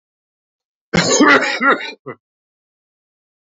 {"cough_length": "3.5 s", "cough_amplitude": 29530, "cough_signal_mean_std_ratio": 0.4, "survey_phase": "alpha (2021-03-01 to 2021-08-12)", "age": "45-64", "gender": "Male", "wearing_mask": "No", "symptom_cough_any": true, "symptom_abdominal_pain": true, "symptom_fatigue": true, "symptom_fever_high_temperature": true, "symptom_change_to_sense_of_smell_or_taste": true, "symptom_onset": "6 days", "smoker_status": "Ex-smoker", "respiratory_condition_asthma": false, "respiratory_condition_other": false, "recruitment_source": "Test and Trace", "submission_delay": "1 day", "covid_test_result": "Positive", "covid_test_method": "RT-qPCR", "covid_ct_value": 18.9, "covid_ct_gene": "ORF1ab gene", "covid_ct_mean": 19.7, "covid_viral_load": "330000 copies/ml", "covid_viral_load_category": "Low viral load (10K-1M copies/ml)"}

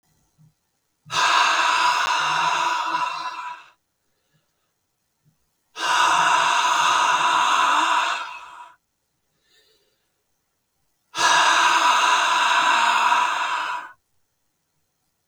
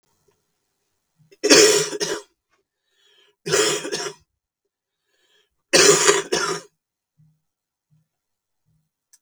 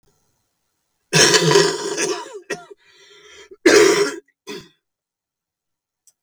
{"exhalation_length": "15.3 s", "exhalation_amplitude": 20415, "exhalation_signal_mean_std_ratio": 0.64, "three_cough_length": "9.2 s", "three_cough_amplitude": 32768, "three_cough_signal_mean_std_ratio": 0.33, "cough_length": "6.2 s", "cough_amplitude": 32768, "cough_signal_mean_std_ratio": 0.4, "survey_phase": "beta (2021-08-13 to 2022-03-07)", "age": "45-64", "gender": "Female", "wearing_mask": "No", "symptom_cough_any": true, "symptom_runny_or_blocked_nose": true, "symptom_shortness_of_breath": true, "symptom_fatigue": true, "symptom_change_to_sense_of_smell_or_taste": true, "symptom_onset": "11 days", "smoker_status": "Ex-smoker", "respiratory_condition_asthma": false, "respiratory_condition_other": false, "recruitment_source": "Test and Trace", "submission_delay": "1 day", "covid_test_result": "Positive", "covid_test_method": "RT-qPCR", "covid_ct_value": 32.3, "covid_ct_gene": "N gene"}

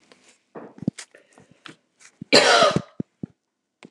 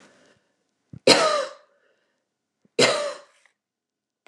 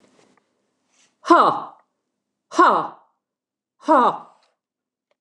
{"cough_length": "3.9 s", "cough_amplitude": 28167, "cough_signal_mean_std_ratio": 0.3, "three_cough_length": "4.3 s", "three_cough_amplitude": 29204, "three_cough_signal_mean_std_ratio": 0.31, "exhalation_length": "5.2 s", "exhalation_amplitude": 29203, "exhalation_signal_mean_std_ratio": 0.32, "survey_phase": "beta (2021-08-13 to 2022-03-07)", "age": "45-64", "gender": "Female", "wearing_mask": "No", "symptom_abdominal_pain": true, "smoker_status": "Never smoked", "respiratory_condition_asthma": false, "respiratory_condition_other": false, "recruitment_source": "REACT", "submission_delay": "7 days", "covid_test_result": "Negative", "covid_test_method": "RT-qPCR"}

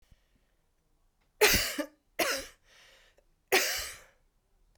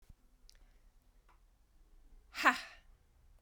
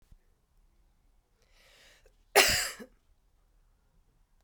{"three_cough_length": "4.8 s", "three_cough_amplitude": 14592, "three_cough_signal_mean_std_ratio": 0.34, "exhalation_length": "3.4 s", "exhalation_amplitude": 8709, "exhalation_signal_mean_std_ratio": 0.22, "cough_length": "4.4 s", "cough_amplitude": 16876, "cough_signal_mean_std_ratio": 0.22, "survey_phase": "beta (2021-08-13 to 2022-03-07)", "age": "45-64", "gender": "Female", "wearing_mask": "No", "symptom_cough_any": true, "symptom_runny_or_blocked_nose": true, "symptom_sore_throat": true, "symptom_fatigue": true, "symptom_change_to_sense_of_smell_or_taste": true, "symptom_onset": "9 days", "smoker_status": "Never smoked", "respiratory_condition_asthma": false, "respiratory_condition_other": false, "recruitment_source": "Test and Trace", "submission_delay": "2 days", "covid_test_result": "Positive", "covid_test_method": "RT-qPCR", "covid_ct_value": 22.3, "covid_ct_gene": "N gene"}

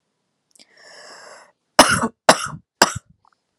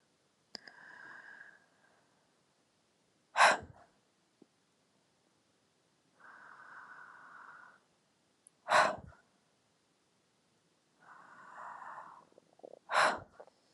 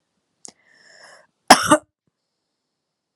{"three_cough_length": "3.6 s", "three_cough_amplitude": 32768, "three_cough_signal_mean_std_ratio": 0.26, "exhalation_length": "13.7 s", "exhalation_amplitude": 8223, "exhalation_signal_mean_std_ratio": 0.23, "cough_length": "3.2 s", "cough_amplitude": 32768, "cough_signal_mean_std_ratio": 0.18, "survey_phase": "beta (2021-08-13 to 2022-03-07)", "age": "18-44", "gender": "Female", "wearing_mask": "No", "symptom_cough_any": true, "symptom_runny_or_blocked_nose": true, "symptom_sore_throat": true, "symptom_change_to_sense_of_smell_or_taste": true, "smoker_status": "Never smoked", "respiratory_condition_asthma": false, "respiratory_condition_other": false, "recruitment_source": "Test and Trace", "submission_delay": "1 day", "covid_test_result": "Positive", "covid_test_method": "LFT"}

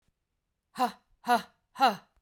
{"exhalation_length": "2.2 s", "exhalation_amplitude": 9898, "exhalation_signal_mean_std_ratio": 0.33, "survey_phase": "beta (2021-08-13 to 2022-03-07)", "age": "45-64", "gender": "Female", "wearing_mask": "Yes", "symptom_runny_or_blocked_nose": true, "symptom_fatigue": true, "symptom_change_to_sense_of_smell_or_taste": true, "smoker_status": "Prefer not to say", "respiratory_condition_asthma": false, "respiratory_condition_other": false, "recruitment_source": "Test and Trace", "submission_delay": "2 days", "covid_test_result": "Positive", "covid_test_method": "LFT"}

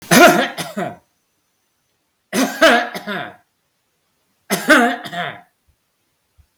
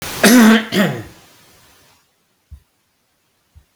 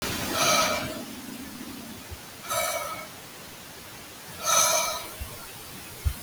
{"three_cough_length": "6.6 s", "three_cough_amplitude": 32768, "three_cough_signal_mean_std_ratio": 0.39, "cough_length": "3.8 s", "cough_amplitude": 32768, "cough_signal_mean_std_ratio": 0.37, "exhalation_length": "6.2 s", "exhalation_amplitude": 12762, "exhalation_signal_mean_std_ratio": 0.66, "survey_phase": "beta (2021-08-13 to 2022-03-07)", "age": "45-64", "gender": "Male", "wearing_mask": "No", "symptom_headache": true, "symptom_onset": "6 days", "smoker_status": "Never smoked", "respiratory_condition_asthma": false, "respiratory_condition_other": false, "recruitment_source": "REACT", "submission_delay": "2 days", "covid_test_result": "Negative", "covid_test_method": "RT-qPCR", "influenza_a_test_result": "Negative", "influenza_b_test_result": "Negative"}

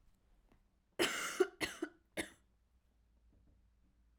{"cough_length": "4.2 s", "cough_amplitude": 3829, "cough_signal_mean_std_ratio": 0.31, "survey_phase": "alpha (2021-03-01 to 2021-08-12)", "age": "18-44", "gender": "Female", "wearing_mask": "No", "symptom_fatigue": true, "symptom_headache": true, "smoker_status": "Never smoked", "respiratory_condition_asthma": false, "respiratory_condition_other": false, "recruitment_source": "Test and Trace", "submission_delay": "1 day", "covid_test_result": "Positive", "covid_test_method": "RT-qPCR", "covid_ct_value": 30.0, "covid_ct_gene": "ORF1ab gene"}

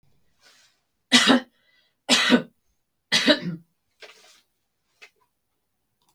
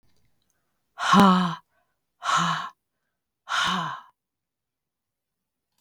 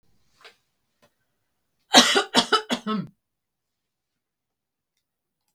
{"three_cough_length": "6.1 s", "three_cough_amplitude": 26789, "three_cough_signal_mean_std_ratio": 0.3, "exhalation_length": "5.8 s", "exhalation_amplitude": 17742, "exhalation_signal_mean_std_ratio": 0.37, "cough_length": "5.5 s", "cough_amplitude": 32768, "cough_signal_mean_std_ratio": 0.25, "survey_phase": "beta (2021-08-13 to 2022-03-07)", "age": "45-64", "gender": "Female", "wearing_mask": "No", "symptom_runny_or_blocked_nose": true, "symptom_headache": true, "symptom_onset": "6 days", "smoker_status": "Never smoked", "respiratory_condition_asthma": false, "respiratory_condition_other": false, "recruitment_source": "Test and Trace", "submission_delay": "2 days", "covid_test_result": "Positive", "covid_test_method": "RT-qPCR", "covid_ct_value": 25.3, "covid_ct_gene": "ORF1ab gene"}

